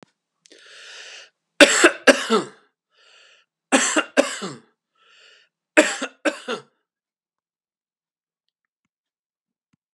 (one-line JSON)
{"three_cough_length": "9.9 s", "three_cough_amplitude": 32768, "three_cough_signal_mean_std_ratio": 0.26, "survey_phase": "beta (2021-08-13 to 2022-03-07)", "age": "65+", "gender": "Male", "wearing_mask": "No", "symptom_none": true, "smoker_status": "Ex-smoker", "respiratory_condition_asthma": false, "respiratory_condition_other": false, "recruitment_source": "REACT", "submission_delay": "2 days", "covid_test_result": "Negative", "covid_test_method": "RT-qPCR", "influenza_a_test_result": "Negative", "influenza_b_test_result": "Negative"}